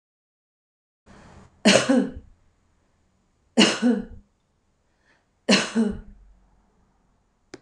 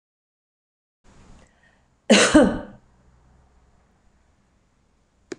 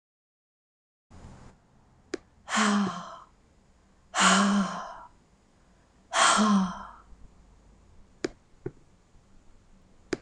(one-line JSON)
{"three_cough_length": "7.6 s", "three_cough_amplitude": 26028, "three_cough_signal_mean_std_ratio": 0.32, "cough_length": "5.4 s", "cough_amplitude": 25608, "cough_signal_mean_std_ratio": 0.24, "exhalation_length": "10.2 s", "exhalation_amplitude": 12512, "exhalation_signal_mean_std_ratio": 0.38, "survey_phase": "beta (2021-08-13 to 2022-03-07)", "age": "45-64", "gender": "Female", "wearing_mask": "No", "symptom_abdominal_pain": true, "symptom_loss_of_taste": true, "smoker_status": "Ex-smoker", "respiratory_condition_asthma": false, "respiratory_condition_other": false, "recruitment_source": "REACT", "submission_delay": "2 days", "covid_test_result": "Negative", "covid_test_method": "RT-qPCR", "influenza_a_test_result": "Negative", "influenza_b_test_result": "Negative"}